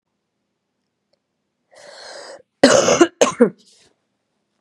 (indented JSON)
{
  "cough_length": "4.6 s",
  "cough_amplitude": 32768,
  "cough_signal_mean_std_ratio": 0.29,
  "survey_phase": "beta (2021-08-13 to 2022-03-07)",
  "age": "18-44",
  "gender": "Female",
  "wearing_mask": "No",
  "symptom_cough_any": true,
  "symptom_runny_or_blocked_nose": true,
  "symptom_sore_throat": true,
  "symptom_onset": "3 days",
  "smoker_status": "Current smoker (1 to 10 cigarettes per day)",
  "respiratory_condition_asthma": false,
  "respiratory_condition_other": false,
  "recruitment_source": "Test and Trace",
  "submission_delay": "1 day",
  "covid_test_result": "Negative",
  "covid_test_method": "RT-qPCR"
}